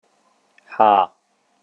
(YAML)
exhalation_length: 1.6 s
exhalation_amplitude: 29014
exhalation_signal_mean_std_ratio: 0.31
survey_phase: beta (2021-08-13 to 2022-03-07)
age: 45-64
gender: Male
wearing_mask: 'No'
symptom_abdominal_pain: true
smoker_status: Never smoked
respiratory_condition_asthma: false
respiratory_condition_other: false
recruitment_source: REACT
submission_delay: 1 day
covid_test_result: Negative
covid_test_method: RT-qPCR